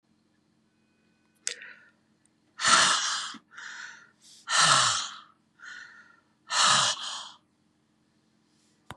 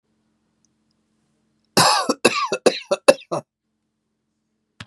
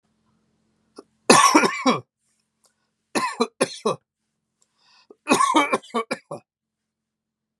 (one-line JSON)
{"exhalation_length": "9.0 s", "exhalation_amplitude": 18140, "exhalation_signal_mean_std_ratio": 0.39, "cough_length": "4.9 s", "cough_amplitude": 32768, "cough_signal_mean_std_ratio": 0.3, "three_cough_length": "7.6 s", "three_cough_amplitude": 32710, "three_cough_signal_mean_std_ratio": 0.34, "survey_phase": "beta (2021-08-13 to 2022-03-07)", "age": "45-64", "gender": "Male", "wearing_mask": "No", "symptom_none": true, "symptom_onset": "12 days", "smoker_status": "Ex-smoker", "respiratory_condition_asthma": false, "respiratory_condition_other": false, "recruitment_source": "REACT", "submission_delay": "1 day", "covid_test_result": "Negative", "covid_test_method": "RT-qPCR"}